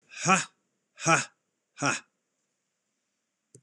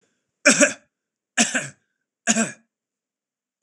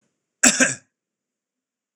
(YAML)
exhalation_length: 3.6 s
exhalation_amplitude: 15548
exhalation_signal_mean_std_ratio: 0.3
three_cough_length: 3.6 s
three_cough_amplitude: 25884
three_cough_signal_mean_std_ratio: 0.32
cough_length: 2.0 s
cough_amplitude: 26028
cough_signal_mean_std_ratio: 0.27
survey_phase: beta (2021-08-13 to 2022-03-07)
age: 45-64
gender: Male
wearing_mask: 'No'
symptom_none: true
smoker_status: Ex-smoker
respiratory_condition_asthma: false
respiratory_condition_other: false
recruitment_source: REACT
submission_delay: 3 days
covid_test_result: Negative
covid_test_method: RT-qPCR
influenza_a_test_result: Negative
influenza_b_test_result: Negative